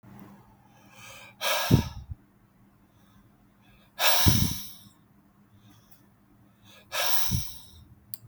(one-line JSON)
{"exhalation_length": "8.3 s", "exhalation_amplitude": 16475, "exhalation_signal_mean_std_ratio": 0.38, "survey_phase": "beta (2021-08-13 to 2022-03-07)", "age": "45-64", "gender": "Male", "wearing_mask": "No", "symptom_none": true, "smoker_status": "Never smoked", "respiratory_condition_asthma": false, "respiratory_condition_other": false, "recruitment_source": "Test and Trace", "submission_delay": "0 days", "covid_test_result": "Negative", "covid_test_method": "LFT"}